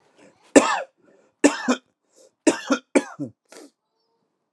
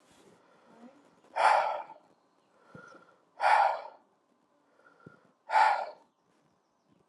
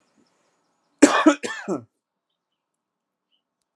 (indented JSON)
{
  "three_cough_length": "4.5 s",
  "three_cough_amplitude": 32768,
  "three_cough_signal_mean_std_ratio": 0.29,
  "exhalation_length": "7.1 s",
  "exhalation_amplitude": 8319,
  "exhalation_signal_mean_std_ratio": 0.34,
  "cough_length": "3.8 s",
  "cough_amplitude": 32767,
  "cough_signal_mean_std_ratio": 0.24,
  "survey_phase": "alpha (2021-03-01 to 2021-08-12)",
  "age": "18-44",
  "gender": "Male",
  "wearing_mask": "No",
  "symptom_cough_any": true,
  "symptom_diarrhoea": true,
  "symptom_onset": "5 days",
  "smoker_status": "Never smoked",
  "respiratory_condition_asthma": false,
  "respiratory_condition_other": false,
  "recruitment_source": "Test and Trace",
  "submission_delay": "2 days",
  "covid_test_result": "Positive",
  "covid_test_method": "RT-qPCR",
  "covid_ct_value": 16.6,
  "covid_ct_gene": "ORF1ab gene",
  "covid_ct_mean": 16.9,
  "covid_viral_load": "2900000 copies/ml",
  "covid_viral_load_category": "High viral load (>1M copies/ml)"
}